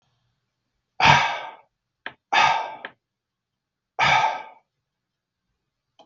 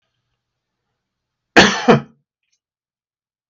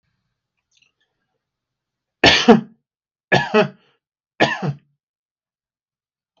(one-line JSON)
{"exhalation_length": "6.1 s", "exhalation_amplitude": 32674, "exhalation_signal_mean_std_ratio": 0.34, "cough_length": "3.5 s", "cough_amplitude": 32768, "cough_signal_mean_std_ratio": 0.24, "three_cough_length": "6.4 s", "three_cough_amplitude": 32768, "three_cough_signal_mean_std_ratio": 0.27, "survey_phase": "beta (2021-08-13 to 2022-03-07)", "age": "45-64", "gender": "Male", "wearing_mask": "No", "symptom_none": true, "symptom_onset": "5 days", "smoker_status": "Never smoked", "respiratory_condition_asthma": false, "respiratory_condition_other": false, "recruitment_source": "REACT", "submission_delay": "5 days", "covid_test_result": "Negative", "covid_test_method": "RT-qPCR", "influenza_a_test_result": "Negative", "influenza_b_test_result": "Negative"}